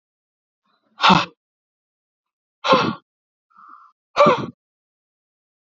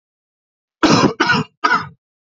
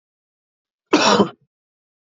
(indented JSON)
{
  "exhalation_length": "5.6 s",
  "exhalation_amplitude": 27846,
  "exhalation_signal_mean_std_ratio": 0.28,
  "three_cough_length": "2.4 s",
  "three_cough_amplitude": 32767,
  "three_cough_signal_mean_std_ratio": 0.45,
  "cough_length": "2.0 s",
  "cough_amplitude": 26904,
  "cough_signal_mean_std_ratio": 0.32,
  "survey_phase": "beta (2021-08-13 to 2022-03-07)",
  "age": "18-44",
  "gender": "Male",
  "wearing_mask": "No",
  "symptom_none": true,
  "smoker_status": "Ex-smoker",
  "respiratory_condition_asthma": false,
  "respiratory_condition_other": false,
  "recruitment_source": "REACT",
  "submission_delay": "1 day",
  "covid_test_result": "Negative",
  "covid_test_method": "RT-qPCR",
  "influenza_a_test_result": "Unknown/Void",
  "influenza_b_test_result": "Unknown/Void"
}